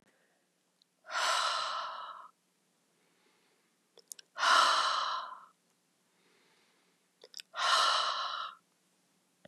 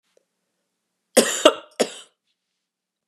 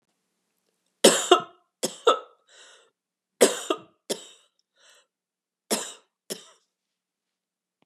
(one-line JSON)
{"exhalation_length": "9.5 s", "exhalation_amplitude": 8315, "exhalation_signal_mean_std_ratio": 0.43, "cough_length": "3.1 s", "cough_amplitude": 32768, "cough_signal_mean_std_ratio": 0.23, "three_cough_length": "7.9 s", "three_cough_amplitude": 28948, "three_cough_signal_mean_std_ratio": 0.23, "survey_phase": "beta (2021-08-13 to 2022-03-07)", "age": "45-64", "gender": "Female", "wearing_mask": "No", "symptom_new_continuous_cough": true, "symptom_runny_or_blocked_nose": true, "symptom_sore_throat": true, "symptom_headache": true, "symptom_change_to_sense_of_smell_or_taste": true, "symptom_loss_of_taste": true, "symptom_onset": "3 days", "smoker_status": "Never smoked", "respiratory_condition_asthma": false, "respiratory_condition_other": false, "recruitment_source": "Test and Trace", "submission_delay": "1 day", "covid_test_result": "Positive", "covid_test_method": "ePCR"}